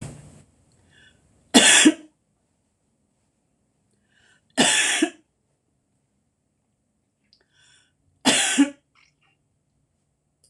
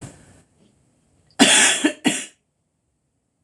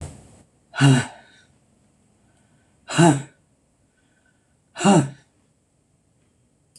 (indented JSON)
{
  "three_cough_length": "10.5 s",
  "three_cough_amplitude": 26028,
  "three_cough_signal_mean_std_ratio": 0.27,
  "cough_length": "3.4 s",
  "cough_amplitude": 26028,
  "cough_signal_mean_std_ratio": 0.34,
  "exhalation_length": "6.8 s",
  "exhalation_amplitude": 24687,
  "exhalation_signal_mean_std_ratio": 0.28,
  "survey_phase": "beta (2021-08-13 to 2022-03-07)",
  "age": "45-64",
  "gender": "Female",
  "wearing_mask": "No",
  "symptom_cough_any": true,
  "symptom_sore_throat": true,
  "symptom_headache": true,
  "symptom_onset": "3 days",
  "smoker_status": "Never smoked",
  "respiratory_condition_asthma": false,
  "respiratory_condition_other": false,
  "recruitment_source": "Test and Trace",
  "submission_delay": "1 day",
  "covid_test_result": "Positive",
  "covid_test_method": "RT-qPCR",
  "covid_ct_value": 17.5,
  "covid_ct_gene": "ORF1ab gene",
  "covid_ct_mean": 17.6,
  "covid_viral_load": "1600000 copies/ml",
  "covid_viral_load_category": "High viral load (>1M copies/ml)"
}